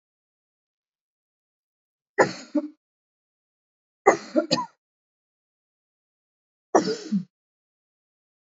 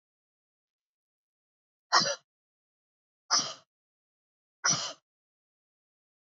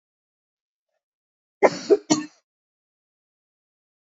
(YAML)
three_cough_length: 8.4 s
three_cough_amplitude: 27508
three_cough_signal_mean_std_ratio: 0.23
exhalation_length: 6.4 s
exhalation_amplitude: 12927
exhalation_signal_mean_std_ratio: 0.23
cough_length: 4.0 s
cough_amplitude: 26917
cough_signal_mean_std_ratio: 0.2
survey_phase: beta (2021-08-13 to 2022-03-07)
age: 65+
gender: Female
wearing_mask: 'No'
symptom_none: true
smoker_status: Ex-smoker
respiratory_condition_asthma: true
respiratory_condition_other: false
recruitment_source: REACT
submission_delay: 1 day
covid_test_result: Negative
covid_test_method: RT-qPCR
influenza_a_test_result: Negative
influenza_b_test_result: Negative